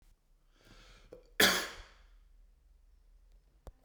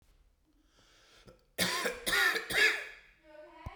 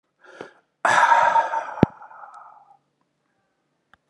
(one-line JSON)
{"cough_length": "3.8 s", "cough_amplitude": 9526, "cough_signal_mean_std_ratio": 0.25, "three_cough_length": "3.8 s", "three_cough_amplitude": 6940, "three_cough_signal_mean_std_ratio": 0.46, "exhalation_length": "4.1 s", "exhalation_amplitude": 32768, "exhalation_signal_mean_std_ratio": 0.37, "survey_phase": "beta (2021-08-13 to 2022-03-07)", "age": "45-64", "gender": "Male", "wearing_mask": "No", "symptom_runny_or_blocked_nose": true, "symptom_sore_throat": true, "symptom_fatigue": true, "symptom_headache": true, "symptom_change_to_sense_of_smell_or_taste": true, "symptom_onset": "7 days", "smoker_status": "Never smoked", "respiratory_condition_asthma": false, "respiratory_condition_other": false, "recruitment_source": "Test and Trace", "submission_delay": "3 days", "covid_test_result": "Positive", "covid_test_method": "RT-qPCR", "covid_ct_value": 20.6, "covid_ct_gene": "ORF1ab gene", "covid_ct_mean": 21.5, "covid_viral_load": "87000 copies/ml", "covid_viral_load_category": "Low viral load (10K-1M copies/ml)"}